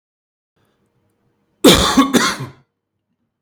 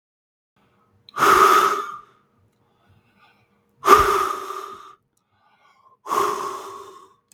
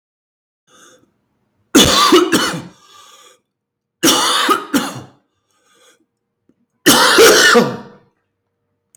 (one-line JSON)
{"cough_length": "3.4 s", "cough_amplitude": 32767, "cough_signal_mean_std_ratio": 0.34, "exhalation_length": "7.3 s", "exhalation_amplitude": 32767, "exhalation_signal_mean_std_ratio": 0.38, "three_cough_length": "9.0 s", "three_cough_amplitude": 32767, "three_cough_signal_mean_std_ratio": 0.44, "survey_phase": "beta (2021-08-13 to 2022-03-07)", "age": "18-44", "gender": "Male", "wearing_mask": "No", "symptom_fatigue": true, "smoker_status": "Never smoked", "respiratory_condition_asthma": false, "respiratory_condition_other": false, "recruitment_source": "REACT", "submission_delay": "3 days", "covid_test_result": "Negative", "covid_test_method": "RT-qPCR", "influenza_a_test_result": "Negative", "influenza_b_test_result": "Negative"}